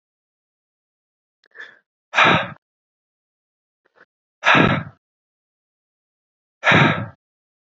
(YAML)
exhalation_length: 7.8 s
exhalation_amplitude: 28353
exhalation_signal_mean_std_ratio: 0.29
survey_phase: beta (2021-08-13 to 2022-03-07)
age: 18-44
gender: Male
wearing_mask: 'No'
symptom_runny_or_blocked_nose: true
symptom_shortness_of_breath: true
smoker_status: Never smoked
respiratory_condition_asthma: false
respiratory_condition_other: false
recruitment_source: Test and Trace
submission_delay: 2 days
covid_test_result: Positive
covid_test_method: RT-qPCR
covid_ct_value: 19.0
covid_ct_gene: ORF1ab gene
covid_ct_mean: 19.3
covid_viral_load: 450000 copies/ml
covid_viral_load_category: Low viral load (10K-1M copies/ml)